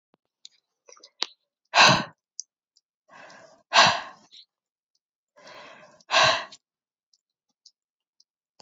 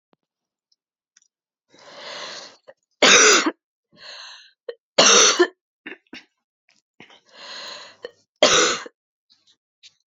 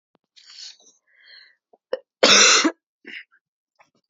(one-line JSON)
{"exhalation_length": "8.6 s", "exhalation_amplitude": 26701, "exhalation_signal_mean_std_ratio": 0.25, "three_cough_length": "10.1 s", "three_cough_amplitude": 32407, "three_cough_signal_mean_std_ratio": 0.31, "cough_length": "4.1 s", "cough_amplitude": 29967, "cough_signal_mean_std_ratio": 0.3, "survey_phase": "beta (2021-08-13 to 2022-03-07)", "age": "45-64", "gender": "Female", "wearing_mask": "No", "symptom_cough_any": true, "symptom_runny_or_blocked_nose": true, "symptom_shortness_of_breath": true, "symptom_fatigue": true, "symptom_fever_high_temperature": true, "symptom_headache": true, "symptom_change_to_sense_of_smell_or_taste": true, "symptom_other": true, "smoker_status": "Never smoked", "respiratory_condition_asthma": true, "respiratory_condition_other": false, "recruitment_source": "Test and Trace", "submission_delay": "2 days", "covid_test_result": "Positive", "covid_test_method": "RT-qPCR", "covid_ct_value": 19.6, "covid_ct_gene": "ORF1ab gene", "covid_ct_mean": 20.6, "covid_viral_load": "180000 copies/ml", "covid_viral_load_category": "Low viral load (10K-1M copies/ml)"}